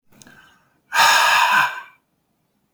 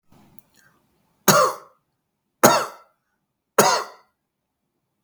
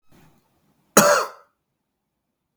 {"exhalation_length": "2.7 s", "exhalation_amplitude": 30359, "exhalation_signal_mean_std_ratio": 0.48, "three_cough_length": "5.0 s", "three_cough_amplitude": 32768, "three_cough_signal_mean_std_ratio": 0.29, "cough_length": "2.6 s", "cough_amplitude": 32768, "cough_signal_mean_std_ratio": 0.26, "survey_phase": "beta (2021-08-13 to 2022-03-07)", "age": "45-64", "gender": "Male", "wearing_mask": "No", "symptom_cough_any": true, "symptom_runny_or_blocked_nose": true, "symptom_sore_throat": true, "symptom_fatigue": true, "symptom_headache": true, "symptom_onset": "2 days", "smoker_status": "Never smoked", "respiratory_condition_asthma": false, "respiratory_condition_other": false, "recruitment_source": "Test and Trace", "submission_delay": "1 day", "covid_test_result": "Positive", "covid_test_method": "RT-qPCR", "covid_ct_value": 17.3, "covid_ct_gene": "ORF1ab gene", "covid_ct_mean": 17.6, "covid_viral_load": "1700000 copies/ml", "covid_viral_load_category": "High viral load (>1M copies/ml)"}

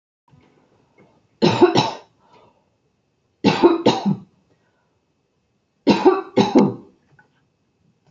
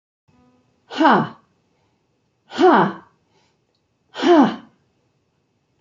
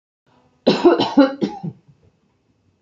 {"three_cough_length": "8.1 s", "three_cough_amplitude": 32768, "three_cough_signal_mean_std_ratio": 0.35, "exhalation_length": "5.8 s", "exhalation_amplitude": 27951, "exhalation_signal_mean_std_ratio": 0.33, "cough_length": "2.8 s", "cough_amplitude": 32767, "cough_signal_mean_std_ratio": 0.38, "survey_phase": "beta (2021-08-13 to 2022-03-07)", "age": "65+", "gender": "Female", "wearing_mask": "No", "symptom_none": true, "smoker_status": "Never smoked", "respiratory_condition_asthma": false, "respiratory_condition_other": false, "recruitment_source": "REACT", "submission_delay": "0 days", "covid_test_result": "Negative", "covid_test_method": "RT-qPCR"}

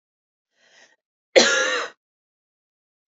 {"cough_length": "3.1 s", "cough_amplitude": 27321, "cough_signal_mean_std_ratio": 0.29, "survey_phase": "beta (2021-08-13 to 2022-03-07)", "age": "18-44", "gender": "Female", "wearing_mask": "No", "symptom_abdominal_pain": true, "smoker_status": "Never smoked", "respiratory_condition_asthma": false, "respiratory_condition_other": false, "recruitment_source": "REACT", "submission_delay": "1 day", "covid_test_result": "Negative", "covid_test_method": "RT-qPCR", "influenza_a_test_result": "Negative", "influenza_b_test_result": "Negative"}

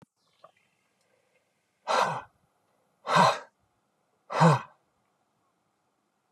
{"exhalation_length": "6.3 s", "exhalation_amplitude": 15725, "exhalation_signal_mean_std_ratio": 0.28, "survey_phase": "beta (2021-08-13 to 2022-03-07)", "age": "45-64", "gender": "Male", "wearing_mask": "No", "symptom_none": true, "smoker_status": "Never smoked", "respiratory_condition_asthma": false, "respiratory_condition_other": false, "recruitment_source": "REACT", "submission_delay": "2 days", "covid_test_result": "Negative", "covid_test_method": "RT-qPCR", "influenza_a_test_result": "Negative", "influenza_b_test_result": "Negative"}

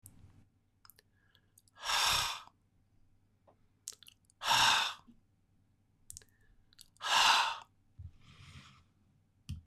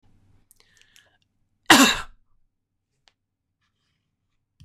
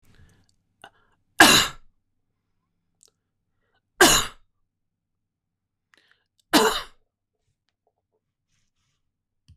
{"exhalation_length": "9.7 s", "exhalation_amplitude": 7018, "exhalation_signal_mean_std_ratio": 0.34, "cough_length": "4.6 s", "cough_amplitude": 25150, "cough_signal_mean_std_ratio": 0.2, "three_cough_length": "9.6 s", "three_cough_amplitude": 25008, "three_cough_signal_mean_std_ratio": 0.22, "survey_phase": "beta (2021-08-13 to 2022-03-07)", "age": "65+", "gender": "Male", "wearing_mask": "No", "symptom_none": true, "smoker_status": "Ex-smoker", "respiratory_condition_asthma": false, "respiratory_condition_other": false, "recruitment_source": "REACT", "submission_delay": "2 days", "covid_test_result": "Negative", "covid_test_method": "RT-qPCR", "influenza_a_test_result": "Negative", "influenza_b_test_result": "Negative"}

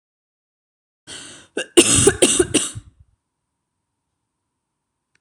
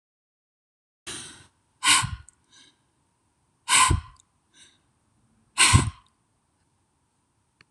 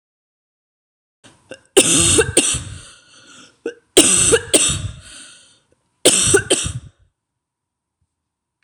{"cough_length": "5.2 s", "cough_amplitude": 26028, "cough_signal_mean_std_ratio": 0.3, "exhalation_length": "7.7 s", "exhalation_amplitude": 23165, "exhalation_signal_mean_std_ratio": 0.27, "three_cough_length": "8.6 s", "three_cough_amplitude": 26028, "three_cough_signal_mean_std_ratio": 0.4, "survey_phase": "beta (2021-08-13 to 2022-03-07)", "age": "18-44", "gender": "Female", "wearing_mask": "No", "symptom_none": true, "smoker_status": "Ex-smoker", "respiratory_condition_asthma": false, "respiratory_condition_other": false, "recruitment_source": "REACT", "submission_delay": "10 days", "covid_test_result": "Negative", "covid_test_method": "RT-qPCR"}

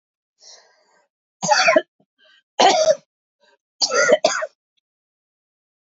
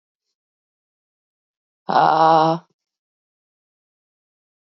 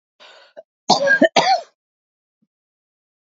{"three_cough_length": "6.0 s", "three_cough_amplitude": 27671, "three_cough_signal_mean_std_ratio": 0.36, "exhalation_length": "4.6 s", "exhalation_amplitude": 26402, "exhalation_signal_mean_std_ratio": 0.28, "cough_length": "3.2 s", "cough_amplitude": 30519, "cough_signal_mean_std_ratio": 0.34, "survey_phase": "alpha (2021-03-01 to 2021-08-12)", "age": "45-64", "gender": "Female", "wearing_mask": "No", "symptom_cough_any": true, "symptom_shortness_of_breath": true, "symptom_fatigue": true, "symptom_headache": true, "symptom_onset": "5 days", "smoker_status": "Never smoked", "respiratory_condition_asthma": false, "respiratory_condition_other": false, "recruitment_source": "Test and Trace", "submission_delay": "1 day", "covid_test_result": "Positive", "covid_test_method": "RT-qPCR"}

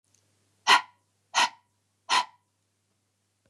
{"exhalation_length": "3.5 s", "exhalation_amplitude": 17151, "exhalation_signal_mean_std_ratio": 0.26, "survey_phase": "beta (2021-08-13 to 2022-03-07)", "age": "45-64", "gender": "Female", "wearing_mask": "No", "symptom_cough_any": true, "symptom_runny_or_blocked_nose": true, "symptom_sore_throat": true, "symptom_fatigue": true, "smoker_status": "Never smoked", "respiratory_condition_asthma": false, "respiratory_condition_other": false, "recruitment_source": "Test and Trace", "submission_delay": "1 day", "covid_test_result": "Positive", "covid_test_method": "RT-qPCR", "covid_ct_value": 20.9, "covid_ct_gene": "ORF1ab gene", "covid_ct_mean": 21.4, "covid_viral_load": "96000 copies/ml", "covid_viral_load_category": "Low viral load (10K-1M copies/ml)"}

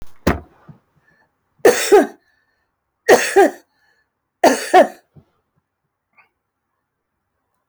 {"three_cough_length": "7.7 s", "three_cough_amplitude": 29718, "three_cough_signal_mean_std_ratio": 0.3, "survey_phase": "alpha (2021-03-01 to 2021-08-12)", "age": "65+", "gender": "Female", "wearing_mask": "No", "symptom_shortness_of_breath": true, "symptom_onset": "5 days", "smoker_status": "Ex-smoker", "respiratory_condition_asthma": false, "respiratory_condition_other": false, "recruitment_source": "REACT", "submission_delay": "1 day", "covid_test_result": "Negative", "covid_test_method": "RT-qPCR"}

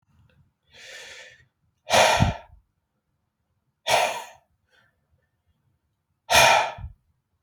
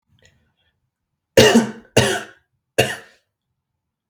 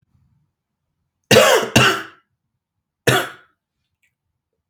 {"exhalation_length": "7.4 s", "exhalation_amplitude": 23347, "exhalation_signal_mean_std_ratio": 0.32, "three_cough_length": "4.1 s", "three_cough_amplitude": 32768, "three_cough_signal_mean_std_ratio": 0.3, "cough_length": "4.7 s", "cough_amplitude": 32768, "cough_signal_mean_std_ratio": 0.32, "survey_phase": "beta (2021-08-13 to 2022-03-07)", "age": "18-44", "gender": "Male", "wearing_mask": "No", "symptom_none": true, "smoker_status": "Current smoker (11 or more cigarettes per day)", "respiratory_condition_asthma": false, "respiratory_condition_other": false, "recruitment_source": "REACT", "submission_delay": "4 days", "covid_test_result": "Negative", "covid_test_method": "RT-qPCR", "influenza_a_test_result": "Negative", "influenza_b_test_result": "Negative"}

